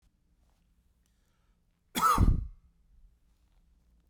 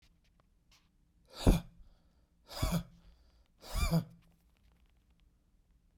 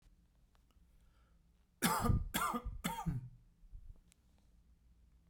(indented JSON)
{
  "cough_length": "4.1 s",
  "cough_amplitude": 8178,
  "cough_signal_mean_std_ratio": 0.29,
  "exhalation_length": "6.0 s",
  "exhalation_amplitude": 9393,
  "exhalation_signal_mean_std_ratio": 0.28,
  "three_cough_length": "5.3 s",
  "three_cough_amplitude": 3645,
  "three_cough_signal_mean_std_ratio": 0.42,
  "survey_phase": "beta (2021-08-13 to 2022-03-07)",
  "age": "45-64",
  "gender": "Male",
  "wearing_mask": "No",
  "symptom_none": true,
  "smoker_status": "Never smoked",
  "respiratory_condition_asthma": false,
  "respiratory_condition_other": false,
  "recruitment_source": "REACT",
  "submission_delay": "1 day",
  "covid_test_result": "Negative",
  "covid_test_method": "RT-qPCR",
  "influenza_a_test_result": "Unknown/Void",
  "influenza_b_test_result": "Unknown/Void"
}